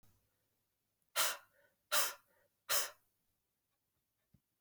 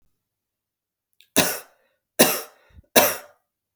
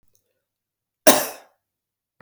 {
  "exhalation_length": "4.6 s",
  "exhalation_amplitude": 3591,
  "exhalation_signal_mean_std_ratio": 0.28,
  "three_cough_length": "3.8 s",
  "three_cough_amplitude": 32768,
  "three_cough_signal_mean_std_ratio": 0.28,
  "cough_length": "2.2 s",
  "cough_amplitude": 32768,
  "cough_signal_mean_std_ratio": 0.2,
  "survey_phase": "beta (2021-08-13 to 2022-03-07)",
  "age": "45-64",
  "gender": "Male",
  "wearing_mask": "No",
  "symptom_cough_any": true,
  "symptom_runny_or_blocked_nose": true,
  "symptom_sore_throat": true,
  "symptom_headache": true,
  "symptom_onset": "3 days",
  "smoker_status": "Never smoked",
  "respiratory_condition_asthma": false,
  "respiratory_condition_other": false,
  "recruitment_source": "Test and Trace",
  "submission_delay": "2 days",
  "covid_test_result": "Positive",
  "covid_test_method": "RT-qPCR",
  "covid_ct_value": 12.4,
  "covid_ct_gene": "ORF1ab gene",
  "covid_ct_mean": 13.0,
  "covid_viral_load": "56000000 copies/ml",
  "covid_viral_load_category": "High viral load (>1M copies/ml)"
}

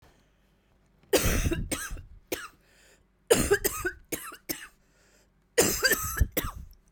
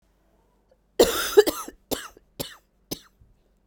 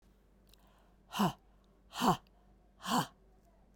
{
  "three_cough_length": "6.9 s",
  "three_cough_amplitude": 15489,
  "three_cough_signal_mean_std_ratio": 0.44,
  "cough_length": "3.7 s",
  "cough_amplitude": 29019,
  "cough_signal_mean_std_ratio": 0.27,
  "exhalation_length": "3.8 s",
  "exhalation_amplitude": 5550,
  "exhalation_signal_mean_std_ratio": 0.33,
  "survey_phase": "beta (2021-08-13 to 2022-03-07)",
  "age": "45-64",
  "gender": "Female",
  "wearing_mask": "No",
  "symptom_cough_any": true,
  "symptom_new_continuous_cough": true,
  "symptom_runny_or_blocked_nose": true,
  "symptom_abdominal_pain": true,
  "symptom_fatigue": true,
  "symptom_headache": true,
  "symptom_change_to_sense_of_smell_or_taste": true,
  "symptom_loss_of_taste": true,
  "smoker_status": "Never smoked",
  "respiratory_condition_asthma": false,
  "respiratory_condition_other": false,
  "recruitment_source": "Test and Trace",
  "submission_delay": "3 days",
  "covid_test_result": "Positive",
  "covid_test_method": "RT-qPCR",
  "covid_ct_value": 26.8,
  "covid_ct_gene": "ORF1ab gene",
  "covid_ct_mean": 27.8,
  "covid_viral_load": "750 copies/ml",
  "covid_viral_load_category": "Minimal viral load (< 10K copies/ml)"
}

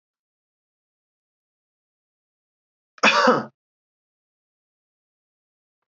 {
  "cough_length": "5.9 s",
  "cough_amplitude": 25322,
  "cough_signal_mean_std_ratio": 0.2,
  "survey_phase": "alpha (2021-03-01 to 2021-08-12)",
  "age": "65+",
  "gender": "Male",
  "wearing_mask": "No",
  "symptom_none": true,
  "smoker_status": "Never smoked",
  "respiratory_condition_asthma": false,
  "respiratory_condition_other": false,
  "recruitment_source": "REACT",
  "submission_delay": "1 day",
  "covid_test_result": "Negative",
  "covid_test_method": "RT-qPCR"
}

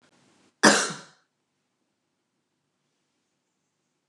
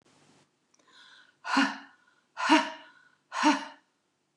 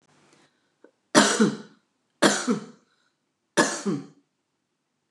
{
  "cough_length": "4.1 s",
  "cough_amplitude": 24627,
  "cough_signal_mean_std_ratio": 0.19,
  "exhalation_length": "4.4 s",
  "exhalation_amplitude": 11652,
  "exhalation_signal_mean_std_ratio": 0.34,
  "three_cough_length": "5.1 s",
  "three_cough_amplitude": 27840,
  "three_cough_signal_mean_std_ratio": 0.34,
  "survey_phase": "beta (2021-08-13 to 2022-03-07)",
  "age": "45-64",
  "gender": "Female",
  "wearing_mask": "No",
  "symptom_cough_any": true,
  "smoker_status": "Never smoked",
  "respiratory_condition_asthma": false,
  "respiratory_condition_other": false,
  "recruitment_source": "REACT",
  "submission_delay": "2 days",
  "covid_test_result": "Negative",
  "covid_test_method": "RT-qPCR"
}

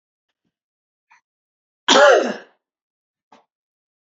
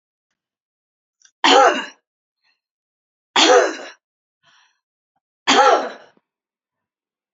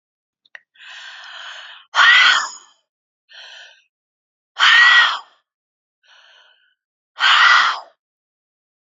{
  "cough_length": "4.0 s",
  "cough_amplitude": 32098,
  "cough_signal_mean_std_ratio": 0.26,
  "three_cough_length": "7.3 s",
  "three_cough_amplitude": 29049,
  "three_cough_signal_mean_std_ratio": 0.32,
  "exhalation_length": "9.0 s",
  "exhalation_amplitude": 31785,
  "exhalation_signal_mean_std_ratio": 0.37,
  "survey_phase": "beta (2021-08-13 to 2022-03-07)",
  "age": "65+",
  "gender": "Female",
  "wearing_mask": "No",
  "symptom_cough_any": true,
  "smoker_status": "Ex-smoker",
  "respiratory_condition_asthma": false,
  "respiratory_condition_other": false,
  "recruitment_source": "REACT",
  "submission_delay": "6 days",
  "covid_test_result": "Negative",
  "covid_test_method": "RT-qPCR",
  "influenza_a_test_result": "Negative",
  "influenza_b_test_result": "Negative"
}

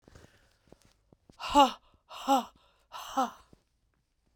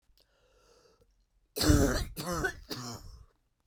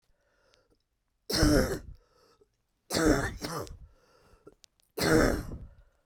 {
  "exhalation_length": "4.4 s",
  "exhalation_amplitude": 15328,
  "exhalation_signal_mean_std_ratio": 0.28,
  "cough_length": "3.7 s",
  "cough_amplitude": 8285,
  "cough_signal_mean_std_ratio": 0.4,
  "three_cough_length": "6.1 s",
  "three_cough_amplitude": 9538,
  "three_cough_signal_mean_std_ratio": 0.41,
  "survey_phase": "beta (2021-08-13 to 2022-03-07)",
  "age": "45-64",
  "gender": "Female",
  "wearing_mask": "No",
  "symptom_cough_any": true,
  "symptom_runny_or_blocked_nose": true,
  "symptom_fatigue": true,
  "symptom_change_to_sense_of_smell_or_taste": true,
  "symptom_loss_of_taste": true,
  "symptom_onset": "5 days",
  "smoker_status": "Never smoked",
  "respiratory_condition_asthma": false,
  "respiratory_condition_other": false,
  "recruitment_source": "Test and Trace",
  "submission_delay": "1 day",
  "covid_test_result": "Positive",
  "covid_test_method": "RT-qPCR",
  "covid_ct_value": 20.0,
  "covid_ct_gene": "N gene"
}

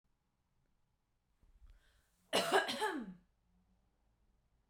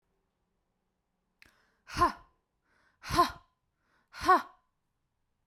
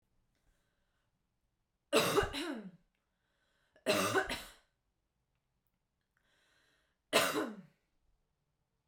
{
  "cough_length": "4.7 s",
  "cough_amplitude": 3977,
  "cough_signal_mean_std_ratio": 0.3,
  "exhalation_length": "5.5 s",
  "exhalation_amplitude": 8832,
  "exhalation_signal_mean_std_ratio": 0.24,
  "three_cough_length": "8.9 s",
  "three_cough_amplitude": 6592,
  "three_cough_signal_mean_std_ratio": 0.32,
  "survey_phase": "beta (2021-08-13 to 2022-03-07)",
  "age": "18-44",
  "gender": "Female",
  "wearing_mask": "No",
  "symptom_fatigue": true,
  "symptom_headache": true,
  "symptom_onset": "12 days",
  "smoker_status": "Ex-smoker",
  "respiratory_condition_asthma": false,
  "respiratory_condition_other": false,
  "recruitment_source": "REACT",
  "submission_delay": "0 days",
  "covid_test_result": "Negative",
  "covid_test_method": "RT-qPCR"
}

